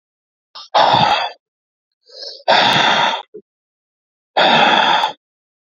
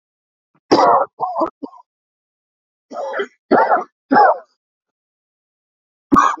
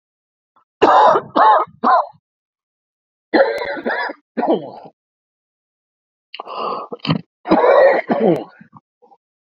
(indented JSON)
{
  "exhalation_length": "5.7 s",
  "exhalation_amplitude": 32768,
  "exhalation_signal_mean_std_ratio": 0.52,
  "cough_length": "6.4 s",
  "cough_amplitude": 28416,
  "cough_signal_mean_std_ratio": 0.4,
  "three_cough_length": "9.5 s",
  "three_cough_amplitude": 30788,
  "three_cough_signal_mean_std_ratio": 0.46,
  "survey_phase": "beta (2021-08-13 to 2022-03-07)",
  "age": "45-64",
  "gender": "Male",
  "wearing_mask": "No",
  "symptom_cough_any": true,
  "symptom_headache": true,
  "smoker_status": "Ex-smoker",
  "recruitment_source": "Test and Trace",
  "submission_delay": "2 days",
  "covid_test_result": "Positive",
  "covid_test_method": "RT-qPCR",
  "covid_ct_value": 34.7,
  "covid_ct_gene": "N gene",
  "covid_ct_mean": 34.9,
  "covid_viral_load": "3.5 copies/ml",
  "covid_viral_load_category": "Minimal viral load (< 10K copies/ml)"
}